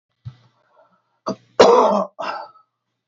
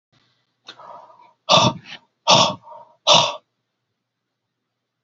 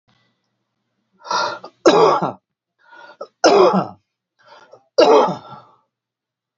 {"cough_length": "3.1 s", "cough_amplitude": 28489, "cough_signal_mean_std_ratio": 0.35, "exhalation_length": "5.0 s", "exhalation_amplitude": 31799, "exhalation_signal_mean_std_ratio": 0.31, "three_cough_length": "6.6 s", "three_cough_amplitude": 29446, "three_cough_signal_mean_std_ratio": 0.38, "survey_phase": "alpha (2021-03-01 to 2021-08-12)", "age": "45-64", "gender": "Male", "wearing_mask": "No", "symptom_change_to_sense_of_smell_or_taste": true, "smoker_status": "Never smoked", "respiratory_condition_asthma": false, "respiratory_condition_other": false, "recruitment_source": "Test and Trace", "submission_delay": "2 days", "covid_test_result": "Positive", "covid_test_method": "RT-qPCR"}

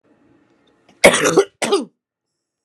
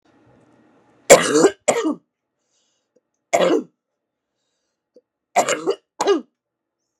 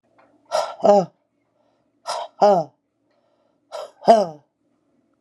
{"cough_length": "2.6 s", "cough_amplitude": 32768, "cough_signal_mean_std_ratio": 0.34, "three_cough_length": "7.0 s", "three_cough_amplitude": 32768, "three_cough_signal_mean_std_ratio": 0.32, "exhalation_length": "5.2 s", "exhalation_amplitude": 32767, "exhalation_signal_mean_std_ratio": 0.33, "survey_phase": "beta (2021-08-13 to 2022-03-07)", "age": "45-64", "gender": "Female", "wearing_mask": "No", "symptom_cough_any": true, "symptom_runny_or_blocked_nose": true, "symptom_sore_throat": true, "symptom_abdominal_pain": true, "symptom_fatigue": true, "symptom_headache": true, "symptom_other": true, "symptom_onset": "3 days", "smoker_status": "Current smoker (1 to 10 cigarettes per day)", "respiratory_condition_asthma": false, "respiratory_condition_other": false, "recruitment_source": "Test and Trace", "submission_delay": "2 days", "covid_test_result": "Positive", "covid_test_method": "RT-qPCR", "covid_ct_value": 24.0, "covid_ct_gene": "ORF1ab gene"}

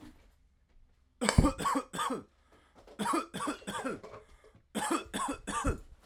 {"three_cough_length": "6.1 s", "three_cough_amplitude": 19723, "three_cough_signal_mean_std_ratio": 0.48, "survey_phase": "alpha (2021-03-01 to 2021-08-12)", "age": "18-44", "gender": "Male", "wearing_mask": "No", "symptom_change_to_sense_of_smell_or_taste": true, "symptom_loss_of_taste": true, "symptom_onset": "6 days", "smoker_status": "Ex-smoker", "respiratory_condition_asthma": false, "respiratory_condition_other": false, "recruitment_source": "Test and Trace", "submission_delay": "1 day", "covid_test_result": "Positive", "covid_test_method": "RT-qPCR", "covid_ct_value": 21.2, "covid_ct_gene": "N gene"}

